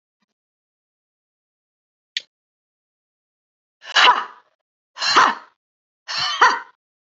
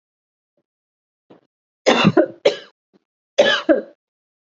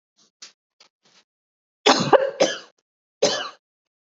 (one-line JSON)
{"exhalation_length": "7.1 s", "exhalation_amplitude": 32116, "exhalation_signal_mean_std_ratio": 0.29, "three_cough_length": "4.4 s", "three_cough_amplitude": 32768, "three_cough_signal_mean_std_ratio": 0.33, "cough_length": "4.0 s", "cough_amplitude": 28793, "cough_signal_mean_std_ratio": 0.31, "survey_phase": "beta (2021-08-13 to 2022-03-07)", "age": "45-64", "gender": "Female", "wearing_mask": "No", "symptom_none": true, "smoker_status": "Never smoked", "respiratory_condition_asthma": false, "respiratory_condition_other": false, "recruitment_source": "REACT", "submission_delay": "1 day", "covid_test_result": "Negative", "covid_test_method": "RT-qPCR", "influenza_a_test_result": "Unknown/Void", "influenza_b_test_result": "Unknown/Void"}